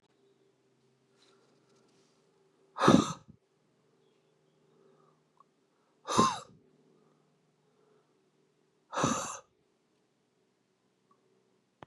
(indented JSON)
{
  "exhalation_length": "11.9 s",
  "exhalation_amplitude": 14870,
  "exhalation_signal_mean_std_ratio": 0.21,
  "survey_phase": "beta (2021-08-13 to 2022-03-07)",
  "age": "45-64",
  "gender": "Male",
  "wearing_mask": "No",
  "symptom_cough_any": true,
  "symptom_sore_throat": true,
  "symptom_diarrhoea": true,
  "symptom_fatigue": true,
  "symptom_change_to_sense_of_smell_or_taste": true,
  "symptom_loss_of_taste": true,
  "symptom_onset": "4 days",
  "smoker_status": "Ex-smoker",
  "respiratory_condition_asthma": false,
  "respiratory_condition_other": false,
  "recruitment_source": "Test and Trace",
  "submission_delay": "2 days",
  "covid_test_result": "Positive",
  "covid_test_method": "RT-qPCR",
  "covid_ct_value": 36.0,
  "covid_ct_gene": "N gene"
}